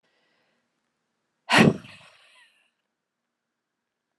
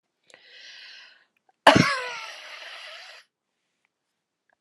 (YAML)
exhalation_length: 4.2 s
exhalation_amplitude: 21198
exhalation_signal_mean_std_ratio: 0.19
cough_length: 4.6 s
cough_amplitude: 31346
cough_signal_mean_std_ratio: 0.24
survey_phase: alpha (2021-03-01 to 2021-08-12)
age: 65+
gender: Female
wearing_mask: 'No'
symptom_shortness_of_breath: true
smoker_status: Ex-smoker
respiratory_condition_asthma: false
respiratory_condition_other: false
recruitment_source: REACT
submission_delay: 2 days
covid_test_result: Negative
covid_test_method: RT-qPCR